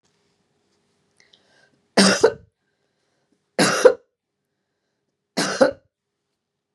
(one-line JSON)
{"three_cough_length": "6.7 s", "three_cough_amplitude": 32703, "three_cough_signal_mean_std_ratio": 0.27, "survey_phase": "beta (2021-08-13 to 2022-03-07)", "age": "45-64", "gender": "Female", "wearing_mask": "No", "symptom_cough_any": true, "symptom_new_continuous_cough": true, "symptom_runny_or_blocked_nose": true, "symptom_sore_throat": true, "symptom_fatigue": true, "symptom_fever_high_temperature": true, "symptom_headache": true, "symptom_onset": "2 days", "smoker_status": "Never smoked", "respiratory_condition_asthma": false, "respiratory_condition_other": false, "recruitment_source": "Test and Trace", "submission_delay": "1 day", "covid_test_result": "Positive", "covid_test_method": "RT-qPCR", "covid_ct_value": 27.5, "covid_ct_gene": "ORF1ab gene", "covid_ct_mean": 27.7, "covid_viral_load": "810 copies/ml", "covid_viral_load_category": "Minimal viral load (< 10K copies/ml)"}